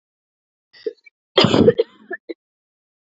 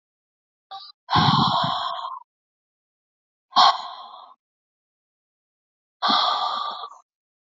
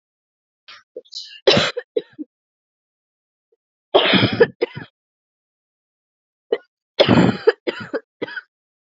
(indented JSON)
{
  "cough_length": "3.1 s",
  "cough_amplitude": 30992,
  "cough_signal_mean_std_ratio": 0.29,
  "exhalation_length": "7.5 s",
  "exhalation_amplitude": 26070,
  "exhalation_signal_mean_std_ratio": 0.4,
  "three_cough_length": "8.9 s",
  "three_cough_amplitude": 29118,
  "three_cough_signal_mean_std_ratio": 0.32,
  "survey_phase": "alpha (2021-03-01 to 2021-08-12)",
  "age": "18-44",
  "gender": "Female",
  "wearing_mask": "No",
  "symptom_cough_any": true,
  "symptom_new_continuous_cough": true,
  "symptom_shortness_of_breath": true,
  "symptom_fatigue": true,
  "symptom_fever_high_temperature": true,
  "symptom_change_to_sense_of_smell_or_taste": true,
  "symptom_loss_of_taste": true,
  "symptom_onset": "3 days",
  "smoker_status": "Never smoked",
  "respiratory_condition_asthma": false,
  "respiratory_condition_other": false,
  "recruitment_source": "Test and Trace",
  "submission_delay": "2 days",
  "covid_test_result": "Positive",
  "covid_test_method": "RT-qPCR",
  "covid_ct_value": 14.9,
  "covid_ct_gene": "ORF1ab gene",
  "covid_ct_mean": 15.3,
  "covid_viral_load": "9600000 copies/ml",
  "covid_viral_load_category": "High viral load (>1M copies/ml)"
}